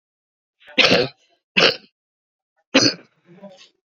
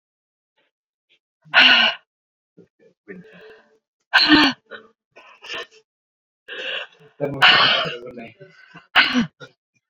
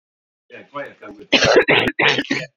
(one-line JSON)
{"three_cough_length": "3.8 s", "three_cough_amplitude": 31235, "three_cough_signal_mean_std_ratio": 0.33, "exhalation_length": "9.9 s", "exhalation_amplitude": 32767, "exhalation_signal_mean_std_ratio": 0.36, "cough_length": "2.6 s", "cough_amplitude": 31879, "cough_signal_mean_std_ratio": 0.51, "survey_phase": "beta (2021-08-13 to 2022-03-07)", "age": "45-64", "gender": "Female", "wearing_mask": "No", "symptom_cough_any": true, "symptom_shortness_of_breath": true, "symptom_onset": "2 days", "smoker_status": "Ex-smoker", "respiratory_condition_asthma": false, "respiratory_condition_other": false, "recruitment_source": "Test and Trace", "submission_delay": "2 days", "covid_test_result": "Positive", "covid_test_method": "RT-qPCR", "covid_ct_value": 34.7, "covid_ct_gene": "ORF1ab gene"}